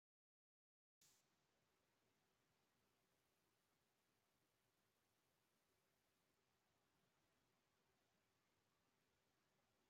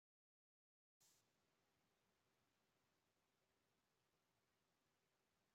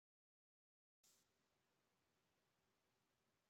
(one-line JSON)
{"three_cough_length": "9.9 s", "three_cough_amplitude": 24, "three_cough_signal_mean_std_ratio": 0.76, "exhalation_length": "5.5 s", "exhalation_amplitude": 18, "exhalation_signal_mean_std_ratio": 0.66, "cough_length": "3.5 s", "cough_amplitude": 21, "cough_signal_mean_std_ratio": 0.58, "survey_phase": "alpha (2021-03-01 to 2021-08-12)", "age": "45-64", "gender": "Female", "wearing_mask": "No", "symptom_none": true, "smoker_status": "Never smoked", "respiratory_condition_asthma": false, "respiratory_condition_other": false, "recruitment_source": "REACT", "submission_delay": "1 day", "covid_test_result": "Negative", "covid_test_method": "RT-qPCR"}